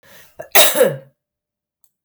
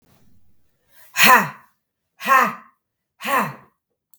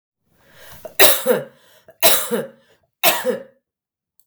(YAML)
cough_length: 2.0 s
cough_amplitude: 32768
cough_signal_mean_std_ratio: 0.35
exhalation_length: 4.2 s
exhalation_amplitude: 32768
exhalation_signal_mean_std_ratio: 0.34
three_cough_length: 4.3 s
three_cough_amplitude: 32768
three_cough_signal_mean_std_ratio: 0.38
survey_phase: beta (2021-08-13 to 2022-03-07)
age: 45-64
gender: Female
wearing_mask: 'No'
symptom_cough_any: true
symptom_runny_or_blocked_nose: true
symptom_sore_throat: true
symptom_fatigue: true
symptom_headache: true
symptom_onset: 5 days
smoker_status: Never smoked
respiratory_condition_asthma: false
respiratory_condition_other: false
recruitment_source: REACT
submission_delay: 2 days
covid_test_result: Negative
covid_test_method: RT-qPCR
influenza_a_test_result: Negative
influenza_b_test_result: Negative